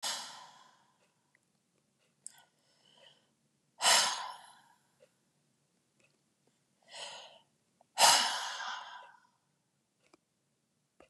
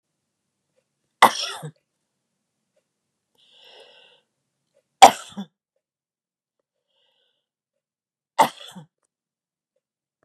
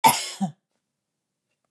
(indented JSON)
{
  "exhalation_length": "11.1 s",
  "exhalation_amplitude": 9914,
  "exhalation_signal_mean_std_ratio": 0.26,
  "three_cough_length": "10.2 s",
  "three_cough_amplitude": 32768,
  "three_cough_signal_mean_std_ratio": 0.13,
  "cough_length": "1.7 s",
  "cough_amplitude": 27111,
  "cough_signal_mean_std_ratio": 0.29,
  "survey_phase": "beta (2021-08-13 to 2022-03-07)",
  "age": "65+",
  "gender": "Female",
  "wearing_mask": "No",
  "symptom_other": true,
  "symptom_onset": "6 days",
  "smoker_status": "Never smoked",
  "respiratory_condition_asthma": false,
  "respiratory_condition_other": false,
  "recruitment_source": "REACT",
  "submission_delay": "2 days",
  "covid_test_result": "Negative",
  "covid_test_method": "RT-qPCR",
  "influenza_a_test_result": "Negative",
  "influenza_b_test_result": "Negative"
}